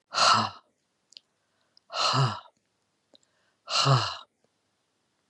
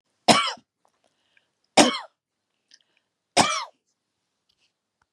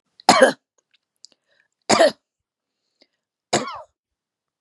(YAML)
exhalation_length: 5.3 s
exhalation_amplitude: 13915
exhalation_signal_mean_std_ratio: 0.38
three_cough_length: 5.1 s
three_cough_amplitude: 31375
three_cough_signal_mean_std_ratio: 0.25
cough_length: 4.6 s
cough_amplitude: 32768
cough_signal_mean_std_ratio: 0.26
survey_phase: beta (2021-08-13 to 2022-03-07)
age: 65+
gender: Female
wearing_mask: 'No'
symptom_none: true
smoker_status: Ex-smoker
respiratory_condition_asthma: false
respiratory_condition_other: false
recruitment_source: REACT
submission_delay: 4 days
covid_test_result: Negative
covid_test_method: RT-qPCR
influenza_a_test_result: Negative
influenza_b_test_result: Negative